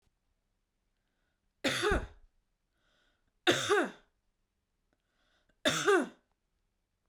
{
  "three_cough_length": "7.1 s",
  "three_cough_amplitude": 9051,
  "three_cough_signal_mean_std_ratio": 0.32,
  "survey_phase": "beta (2021-08-13 to 2022-03-07)",
  "age": "18-44",
  "gender": "Female",
  "wearing_mask": "No",
  "symptom_none": true,
  "smoker_status": "Never smoked",
  "respiratory_condition_asthma": false,
  "respiratory_condition_other": false,
  "recruitment_source": "REACT",
  "submission_delay": "4 days",
  "covid_test_result": "Negative",
  "covid_test_method": "RT-qPCR"
}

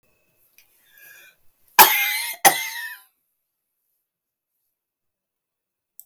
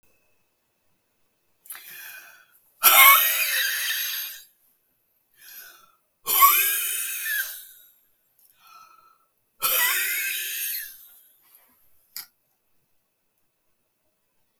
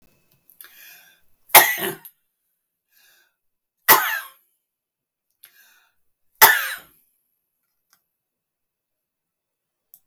{
  "cough_length": "6.1 s",
  "cough_amplitude": 32767,
  "cough_signal_mean_std_ratio": 0.23,
  "exhalation_length": "14.6 s",
  "exhalation_amplitude": 32265,
  "exhalation_signal_mean_std_ratio": 0.36,
  "three_cough_length": "10.1 s",
  "three_cough_amplitude": 32768,
  "three_cough_signal_mean_std_ratio": 0.2,
  "survey_phase": "beta (2021-08-13 to 2022-03-07)",
  "age": "65+",
  "gender": "Female",
  "wearing_mask": "No",
  "symptom_none": true,
  "smoker_status": "Ex-smoker",
  "respiratory_condition_asthma": false,
  "respiratory_condition_other": false,
  "recruitment_source": "REACT",
  "submission_delay": "2 days",
  "covid_test_result": "Negative",
  "covid_test_method": "RT-qPCR",
  "influenza_a_test_result": "Negative",
  "influenza_b_test_result": "Negative"
}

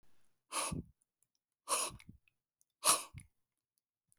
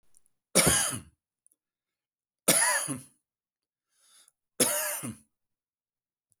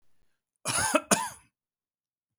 {
  "exhalation_length": "4.2 s",
  "exhalation_amplitude": 5638,
  "exhalation_signal_mean_std_ratio": 0.3,
  "three_cough_length": "6.4 s",
  "three_cough_amplitude": 19251,
  "three_cough_signal_mean_std_ratio": 0.35,
  "cough_length": "2.4 s",
  "cough_amplitude": 19702,
  "cough_signal_mean_std_ratio": 0.34,
  "survey_phase": "beta (2021-08-13 to 2022-03-07)",
  "age": "65+",
  "gender": "Male",
  "wearing_mask": "No",
  "symptom_none": true,
  "smoker_status": "Never smoked",
  "respiratory_condition_asthma": false,
  "respiratory_condition_other": false,
  "recruitment_source": "REACT",
  "submission_delay": "1 day",
  "covid_test_result": "Negative",
  "covid_test_method": "RT-qPCR"
}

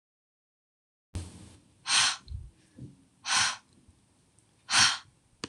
{
  "exhalation_length": "5.5 s",
  "exhalation_amplitude": 12198,
  "exhalation_signal_mean_std_ratio": 0.35,
  "survey_phase": "beta (2021-08-13 to 2022-03-07)",
  "age": "18-44",
  "gender": "Female",
  "wearing_mask": "No",
  "symptom_none": true,
  "smoker_status": "Never smoked",
  "respiratory_condition_asthma": false,
  "respiratory_condition_other": false,
  "recruitment_source": "REACT",
  "submission_delay": "0 days",
  "covid_test_result": "Negative",
  "covid_test_method": "RT-qPCR"
}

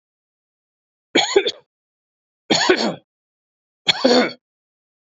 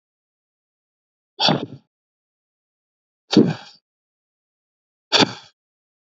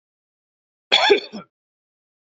{
  "three_cough_length": "5.1 s",
  "three_cough_amplitude": 31684,
  "three_cough_signal_mean_std_ratio": 0.35,
  "exhalation_length": "6.1 s",
  "exhalation_amplitude": 29999,
  "exhalation_signal_mean_std_ratio": 0.23,
  "cough_length": "2.4 s",
  "cough_amplitude": 27462,
  "cough_signal_mean_std_ratio": 0.28,
  "survey_phase": "beta (2021-08-13 to 2022-03-07)",
  "age": "45-64",
  "gender": "Male",
  "wearing_mask": "No",
  "symptom_none": true,
  "smoker_status": "Never smoked",
  "respiratory_condition_asthma": false,
  "respiratory_condition_other": false,
  "recruitment_source": "REACT",
  "submission_delay": "1 day",
  "covid_test_result": "Negative",
  "covid_test_method": "RT-qPCR"
}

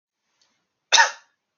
{
  "cough_length": "1.6 s",
  "cough_amplitude": 27579,
  "cough_signal_mean_std_ratio": 0.25,
  "survey_phase": "alpha (2021-03-01 to 2021-08-12)",
  "age": "18-44",
  "gender": "Male",
  "wearing_mask": "No",
  "symptom_none": true,
  "smoker_status": "Never smoked",
  "respiratory_condition_asthma": false,
  "respiratory_condition_other": false,
  "recruitment_source": "REACT",
  "submission_delay": "1 day",
  "covid_test_result": "Negative",
  "covid_test_method": "RT-qPCR"
}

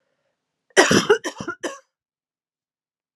{
  "cough_length": "3.2 s",
  "cough_amplitude": 31898,
  "cough_signal_mean_std_ratio": 0.3,
  "survey_phase": "alpha (2021-03-01 to 2021-08-12)",
  "age": "18-44",
  "gender": "Female",
  "wearing_mask": "No",
  "symptom_new_continuous_cough": true,
  "symptom_fatigue": true,
  "symptom_headache": true,
  "symptom_onset": "4 days",
  "smoker_status": "Ex-smoker",
  "respiratory_condition_asthma": false,
  "respiratory_condition_other": false,
  "recruitment_source": "Test and Trace",
  "submission_delay": "2 days",
  "covid_test_result": "Positive",
  "covid_test_method": "RT-qPCR",
  "covid_ct_value": 22.8,
  "covid_ct_gene": "ORF1ab gene",
  "covid_ct_mean": 23.0,
  "covid_viral_load": "29000 copies/ml",
  "covid_viral_load_category": "Low viral load (10K-1M copies/ml)"
}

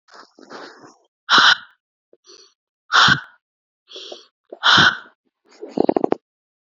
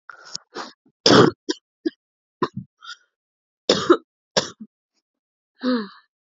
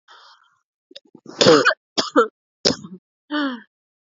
{
  "exhalation_length": "6.7 s",
  "exhalation_amplitude": 29721,
  "exhalation_signal_mean_std_ratio": 0.32,
  "cough_length": "6.4 s",
  "cough_amplitude": 31951,
  "cough_signal_mean_std_ratio": 0.28,
  "three_cough_length": "4.1 s",
  "three_cough_amplitude": 32768,
  "three_cough_signal_mean_std_ratio": 0.35,
  "survey_phase": "alpha (2021-03-01 to 2021-08-12)",
  "age": "18-44",
  "gender": "Female",
  "wearing_mask": "No",
  "symptom_cough_any": true,
  "symptom_new_continuous_cough": true,
  "symptom_shortness_of_breath": true,
  "symptom_abdominal_pain": true,
  "symptom_diarrhoea": true,
  "symptom_fatigue": true,
  "symptom_fever_high_temperature": true,
  "symptom_headache": true,
  "smoker_status": "Never smoked",
  "respiratory_condition_asthma": false,
  "respiratory_condition_other": false,
  "recruitment_source": "Test and Trace",
  "submission_delay": "2 days",
  "covid_test_result": "Positive",
  "covid_test_method": "RT-qPCR"
}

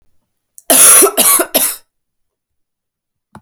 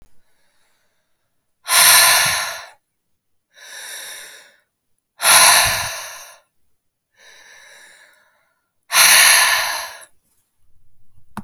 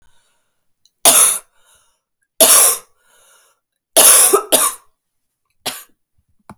{
  "cough_length": "3.4 s",
  "cough_amplitude": 32768,
  "cough_signal_mean_std_ratio": 0.42,
  "exhalation_length": "11.4 s",
  "exhalation_amplitude": 32768,
  "exhalation_signal_mean_std_ratio": 0.39,
  "three_cough_length": "6.6 s",
  "three_cough_amplitude": 32768,
  "three_cough_signal_mean_std_ratio": 0.37,
  "survey_phase": "alpha (2021-03-01 to 2021-08-12)",
  "age": "18-44",
  "gender": "Female",
  "wearing_mask": "No",
  "symptom_cough_any": true,
  "symptom_shortness_of_breath": true,
  "symptom_diarrhoea": true,
  "symptom_fatigue": true,
  "symptom_fever_high_temperature": true,
  "symptom_headache": true,
  "symptom_change_to_sense_of_smell_or_taste": true,
  "symptom_loss_of_taste": true,
  "symptom_onset": "4 days",
  "smoker_status": "Ex-smoker",
  "respiratory_condition_asthma": false,
  "respiratory_condition_other": false,
  "recruitment_source": "Test and Trace",
  "submission_delay": "1 day",
  "covid_test_result": "Positive",
  "covid_test_method": "RT-qPCR"
}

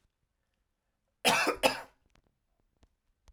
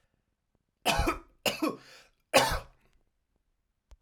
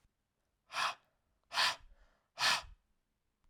{
  "cough_length": "3.3 s",
  "cough_amplitude": 12356,
  "cough_signal_mean_std_ratio": 0.28,
  "three_cough_length": "4.0 s",
  "three_cough_amplitude": 17669,
  "three_cough_signal_mean_std_ratio": 0.34,
  "exhalation_length": "3.5 s",
  "exhalation_amplitude": 3542,
  "exhalation_signal_mean_std_ratio": 0.34,
  "survey_phase": "alpha (2021-03-01 to 2021-08-12)",
  "age": "18-44",
  "gender": "Male",
  "wearing_mask": "No",
  "symptom_none": true,
  "smoker_status": "Never smoked",
  "respiratory_condition_asthma": false,
  "respiratory_condition_other": false,
  "recruitment_source": "REACT",
  "submission_delay": "1 day",
  "covid_test_result": "Negative",
  "covid_test_method": "RT-qPCR"
}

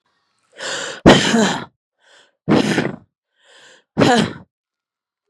{
  "exhalation_length": "5.3 s",
  "exhalation_amplitude": 32768,
  "exhalation_signal_mean_std_ratio": 0.4,
  "survey_phase": "beta (2021-08-13 to 2022-03-07)",
  "age": "18-44",
  "gender": "Female",
  "wearing_mask": "No",
  "symptom_cough_any": true,
  "symptom_runny_or_blocked_nose": true,
  "symptom_sore_throat": true,
  "symptom_fatigue": true,
  "symptom_loss_of_taste": true,
  "symptom_onset": "4 days",
  "smoker_status": "Never smoked",
  "respiratory_condition_asthma": false,
  "respiratory_condition_other": false,
  "recruitment_source": "Test and Trace",
  "submission_delay": "1 day",
  "covid_test_result": "Positive",
  "covid_test_method": "RT-qPCR",
  "covid_ct_value": 15.8,
  "covid_ct_gene": "ORF1ab gene",
  "covid_ct_mean": 16.0,
  "covid_viral_load": "5800000 copies/ml",
  "covid_viral_load_category": "High viral load (>1M copies/ml)"
}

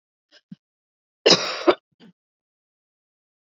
{
  "cough_length": "3.5 s",
  "cough_amplitude": 29567,
  "cough_signal_mean_std_ratio": 0.22,
  "survey_phase": "beta (2021-08-13 to 2022-03-07)",
  "age": "18-44",
  "gender": "Female",
  "wearing_mask": "No",
  "symptom_none": true,
  "smoker_status": "Never smoked",
  "respiratory_condition_asthma": false,
  "respiratory_condition_other": false,
  "recruitment_source": "REACT",
  "submission_delay": "8 days",
  "covid_test_result": "Negative",
  "covid_test_method": "RT-qPCR"
}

